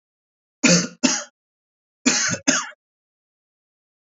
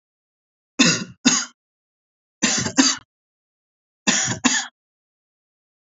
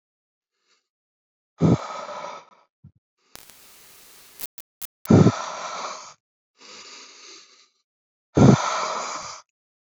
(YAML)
cough_length: 4.0 s
cough_amplitude: 28274
cough_signal_mean_std_ratio: 0.36
three_cough_length: 6.0 s
three_cough_amplitude: 29542
three_cough_signal_mean_std_ratio: 0.36
exhalation_length: 10.0 s
exhalation_amplitude: 29015
exhalation_signal_mean_std_ratio: 0.28
survey_phase: alpha (2021-03-01 to 2021-08-12)
age: 18-44
gender: Male
wearing_mask: 'No'
symptom_none: true
smoker_status: Never smoked
respiratory_condition_asthma: false
respiratory_condition_other: false
recruitment_source: REACT
submission_delay: 1 day
covid_test_result: Negative
covid_test_method: RT-qPCR